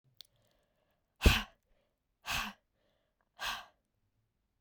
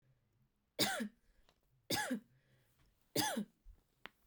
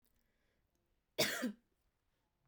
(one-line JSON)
{"exhalation_length": "4.6 s", "exhalation_amplitude": 10293, "exhalation_signal_mean_std_ratio": 0.22, "three_cough_length": "4.3 s", "three_cough_amplitude": 3101, "three_cough_signal_mean_std_ratio": 0.38, "cough_length": "2.5 s", "cough_amplitude": 3160, "cough_signal_mean_std_ratio": 0.28, "survey_phase": "beta (2021-08-13 to 2022-03-07)", "age": "18-44", "gender": "Female", "wearing_mask": "No", "symptom_runny_or_blocked_nose": true, "symptom_shortness_of_breath": true, "symptom_fatigue": true, "symptom_headache": true, "smoker_status": "Never smoked", "respiratory_condition_asthma": false, "respiratory_condition_other": false, "recruitment_source": "Test and Trace", "submission_delay": "2 days", "covid_test_result": "Positive", "covid_test_method": "RT-qPCR", "covid_ct_value": 16.8, "covid_ct_gene": "S gene", "covid_ct_mean": 17.1, "covid_viral_load": "2500000 copies/ml", "covid_viral_load_category": "High viral load (>1M copies/ml)"}